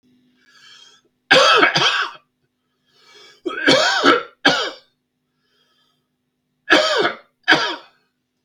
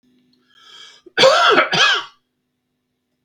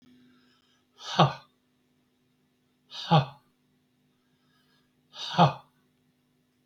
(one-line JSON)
{"three_cough_length": "8.4 s", "three_cough_amplitude": 32768, "three_cough_signal_mean_std_ratio": 0.43, "cough_length": "3.2 s", "cough_amplitude": 32768, "cough_signal_mean_std_ratio": 0.42, "exhalation_length": "6.7 s", "exhalation_amplitude": 16674, "exhalation_signal_mean_std_ratio": 0.24, "survey_phase": "beta (2021-08-13 to 2022-03-07)", "age": "65+", "gender": "Male", "wearing_mask": "No", "symptom_none": true, "smoker_status": "Ex-smoker", "respiratory_condition_asthma": false, "respiratory_condition_other": false, "recruitment_source": "REACT", "submission_delay": "13 days", "covid_test_result": "Negative", "covid_test_method": "RT-qPCR", "influenza_a_test_result": "Negative", "influenza_b_test_result": "Negative"}